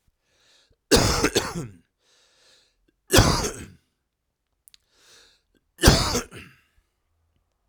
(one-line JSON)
{"three_cough_length": "7.7 s", "three_cough_amplitude": 32768, "three_cough_signal_mean_std_ratio": 0.31, "survey_phase": "alpha (2021-03-01 to 2021-08-12)", "age": "45-64", "gender": "Male", "wearing_mask": "No", "symptom_cough_any": true, "symptom_shortness_of_breath": true, "symptom_fatigue": true, "symptom_headache": true, "symptom_onset": "3 days", "smoker_status": "Ex-smoker", "respiratory_condition_asthma": false, "respiratory_condition_other": false, "recruitment_source": "Test and Trace", "submission_delay": "2 days", "covid_test_result": "Positive", "covid_test_method": "RT-qPCR", "covid_ct_value": 23.4, "covid_ct_gene": "ORF1ab gene", "covid_ct_mean": 24.3, "covid_viral_load": "11000 copies/ml", "covid_viral_load_category": "Low viral load (10K-1M copies/ml)"}